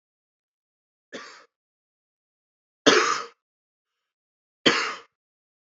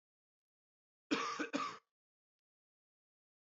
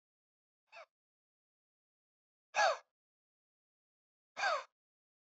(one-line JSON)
{"three_cough_length": "5.7 s", "three_cough_amplitude": 26521, "three_cough_signal_mean_std_ratio": 0.24, "cough_length": "3.5 s", "cough_amplitude": 2079, "cough_signal_mean_std_ratio": 0.31, "exhalation_length": "5.4 s", "exhalation_amplitude": 3683, "exhalation_signal_mean_std_ratio": 0.22, "survey_phase": "beta (2021-08-13 to 2022-03-07)", "age": "18-44", "gender": "Male", "wearing_mask": "No", "symptom_cough_any": true, "symptom_runny_or_blocked_nose": true, "symptom_shortness_of_breath": true, "symptom_sore_throat": true, "symptom_fatigue": true, "symptom_headache": true, "symptom_change_to_sense_of_smell_or_taste": true, "symptom_onset": "3 days", "smoker_status": "Current smoker (11 or more cigarettes per day)", "respiratory_condition_asthma": false, "respiratory_condition_other": false, "recruitment_source": "Test and Trace", "submission_delay": "2 days", "covid_test_result": "Positive", "covid_test_method": "RT-qPCR", "covid_ct_value": 15.2, "covid_ct_gene": "ORF1ab gene", "covid_ct_mean": 15.4, "covid_viral_load": "9000000 copies/ml", "covid_viral_load_category": "High viral load (>1M copies/ml)"}